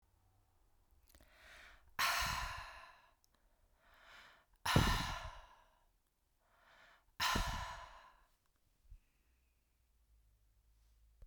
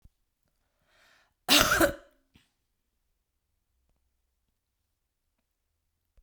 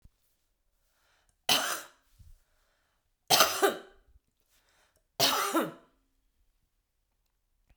{"exhalation_length": "11.3 s", "exhalation_amplitude": 5890, "exhalation_signal_mean_std_ratio": 0.34, "cough_length": "6.2 s", "cough_amplitude": 25539, "cough_signal_mean_std_ratio": 0.2, "three_cough_length": "7.8 s", "three_cough_amplitude": 18970, "three_cough_signal_mean_std_ratio": 0.3, "survey_phase": "beta (2021-08-13 to 2022-03-07)", "age": "45-64", "gender": "Female", "wearing_mask": "No", "symptom_shortness_of_breath": true, "symptom_fatigue": true, "symptom_other": true, "smoker_status": "Ex-smoker", "respiratory_condition_asthma": false, "respiratory_condition_other": false, "recruitment_source": "REACT", "submission_delay": "2 days", "covid_test_result": "Positive", "covid_test_method": "RT-qPCR", "covid_ct_value": 21.0, "covid_ct_gene": "E gene", "influenza_a_test_result": "Negative", "influenza_b_test_result": "Negative"}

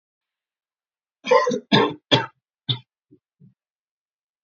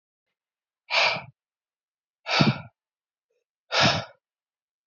{"cough_length": "4.4 s", "cough_amplitude": 26467, "cough_signal_mean_std_ratio": 0.3, "exhalation_length": "4.9 s", "exhalation_amplitude": 19786, "exhalation_signal_mean_std_ratio": 0.33, "survey_phase": "beta (2021-08-13 to 2022-03-07)", "age": "18-44", "gender": "Male", "wearing_mask": "No", "symptom_cough_any": true, "symptom_shortness_of_breath": true, "symptom_diarrhoea": true, "symptom_fatigue": true, "symptom_headache": true, "symptom_change_to_sense_of_smell_or_taste": true, "symptom_onset": "4 days", "smoker_status": "Never smoked", "respiratory_condition_asthma": false, "respiratory_condition_other": false, "recruitment_source": "Test and Trace", "submission_delay": "2 days", "covid_test_result": "Positive", "covid_test_method": "ePCR"}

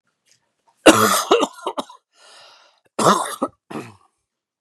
{"cough_length": "4.6 s", "cough_amplitude": 32768, "cough_signal_mean_std_ratio": 0.35, "survey_phase": "beta (2021-08-13 to 2022-03-07)", "age": "45-64", "gender": "Male", "wearing_mask": "No", "symptom_none": true, "smoker_status": "Never smoked", "respiratory_condition_asthma": false, "respiratory_condition_other": false, "recruitment_source": "REACT", "submission_delay": "2 days", "covid_test_result": "Negative", "covid_test_method": "RT-qPCR", "influenza_a_test_result": "Negative", "influenza_b_test_result": "Negative"}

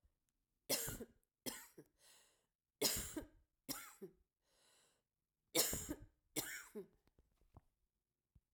{"three_cough_length": "8.5 s", "three_cough_amplitude": 3012, "three_cough_signal_mean_std_ratio": 0.33, "survey_phase": "alpha (2021-03-01 to 2021-08-12)", "age": "65+", "gender": "Female", "wearing_mask": "No", "symptom_fatigue": true, "symptom_headache": true, "symptom_change_to_sense_of_smell_or_taste": true, "symptom_loss_of_taste": true, "symptom_onset": "3 days", "smoker_status": "Ex-smoker", "respiratory_condition_asthma": false, "respiratory_condition_other": false, "recruitment_source": "Test and Trace", "submission_delay": "2 days", "covid_test_result": "Positive", "covid_test_method": "RT-qPCR", "covid_ct_value": 19.1, "covid_ct_gene": "ORF1ab gene", "covid_ct_mean": 19.5, "covid_viral_load": "400000 copies/ml", "covid_viral_load_category": "Low viral load (10K-1M copies/ml)"}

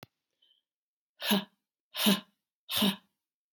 {"exhalation_length": "3.5 s", "exhalation_amplitude": 9806, "exhalation_signal_mean_std_ratio": 0.34, "survey_phase": "beta (2021-08-13 to 2022-03-07)", "age": "45-64", "gender": "Female", "wearing_mask": "No", "symptom_cough_any": true, "symptom_runny_or_blocked_nose": true, "symptom_change_to_sense_of_smell_or_taste": true, "symptom_onset": "3 days", "smoker_status": "Never smoked", "respiratory_condition_asthma": false, "respiratory_condition_other": false, "recruitment_source": "Test and Trace", "submission_delay": "2 days", "covid_test_result": "Positive", "covid_test_method": "RT-qPCR", "covid_ct_value": 15.3, "covid_ct_gene": "N gene", "covid_ct_mean": 16.5, "covid_viral_load": "3800000 copies/ml", "covid_viral_load_category": "High viral load (>1M copies/ml)"}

